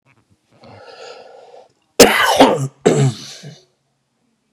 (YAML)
cough_length: 4.5 s
cough_amplitude: 32768
cough_signal_mean_std_ratio: 0.37
survey_phase: beta (2021-08-13 to 2022-03-07)
age: 45-64
gender: Male
wearing_mask: 'Yes'
symptom_shortness_of_breath: true
symptom_fatigue: true
smoker_status: Ex-smoker
respiratory_condition_asthma: false
respiratory_condition_other: false
recruitment_source: REACT
submission_delay: 20 days
covid_test_result: Negative
covid_test_method: RT-qPCR
influenza_a_test_result: Negative
influenza_b_test_result: Negative